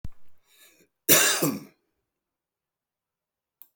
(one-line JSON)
{"cough_length": "3.8 s", "cough_amplitude": 30177, "cough_signal_mean_std_ratio": 0.3, "survey_phase": "beta (2021-08-13 to 2022-03-07)", "age": "45-64", "gender": "Male", "wearing_mask": "No", "symptom_none": true, "smoker_status": "Current smoker (11 or more cigarettes per day)", "respiratory_condition_asthma": false, "respiratory_condition_other": false, "recruitment_source": "REACT", "submission_delay": "1 day", "covid_test_result": "Negative", "covid_test_method": "RT-qPCR"}